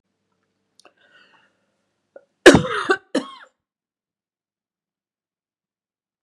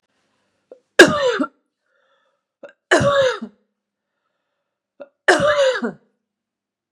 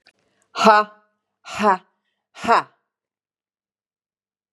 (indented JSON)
{
  "cough_length": "6.2 s",
  "cough_amplitude": 32768,
  "cough_signal_mean_std_ratio": 0.17,
  "three_cough_length": "6.9 s",
  "three_cough_amplitude": 32768,
  "three_cough_signal_mean_std_ratio": 0.35,
  "exhalation_length": "4.5 s",
  "exhalation_amplitude": 29964,
  "exhalation_signal_mean_std_ratio": 0.28,
  "survey_phase": "beta (2021-08-13 to 2022-03-07)",
  "age": "45-64",
  "gender": "Female",
  "wearing_mask": "No",
  "symptom_none": true,
  "smoker_status": "Never smoked",
  "respiratory_condition_asthma": false,
  "respiratory_condition_other": true,
  "recruitment_source": "REACT",
  "submission_delay": "1 day",
  "covid_test_result": "Negative",
  "covid_test_method": "RT-qPCR",
  "influenza_a_test_result": "Unknown/Void",
  "influenza_b_test_result": "Unknown/Void"
}